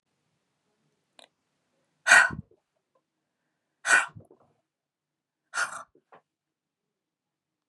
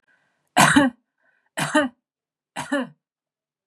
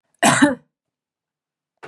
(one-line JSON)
{"exhalation_length": "7.7 s", "exhalation_amplitude": 22701, "exhalation_signal_mean_std_ratio": 0.2, "three_cough_length": "3.7 s", "three_cough_amplitude": 30362, "three_cough_signal_mean_std_ratio": 0.35, "cough_length": "1.9 s", "cough_amplitude": 29456, "cough_signal_mean_std_ratio": 0.32, "survey_phase": "beta (2021-08-13 to 2022-03-07)", "age": "45-64", "gender": "Female", "wearing_mask": "No", "symptom_none": true, "smoker_status": "Never smoked", "respiratory_condition_asthma": false, "respiratory_condition_other": false, "recruitment_source": "REACT", "submission_delay": "0 days", "covid_test_result": "Negative", "covid_test_method": "RT-qPCR", "influenza_a_test_result": "Unknown/Void", "influenza_b_test_result": "Unknown/Void"}